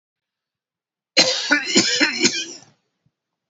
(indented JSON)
{
  "cough_length": "3.5 s",
  "cough_amplitude": 30354,
  "cough_signal_mean_std_ratio": 0.44,
  "survey_phase": "beta (2021-08-13 to 2022-03-07)",
  "age": "65+",
  "gender": "Male",
  "wearing_mask": "No",
  "symptom_none": true,
  "smoker_status": "Never smoked",
  "respiratory_condition_asthma": false,
  "respiratory_condition_other": false,
  "recruitment_source": "REACT",
  "submission_delay": "3 days",
  "covid_test_result": "Negative",
  "covid_test_method": "RT-qPCR",
  "influenza_a_test_result": "Negative",
  "influenza_b_test_result": "Negative"
}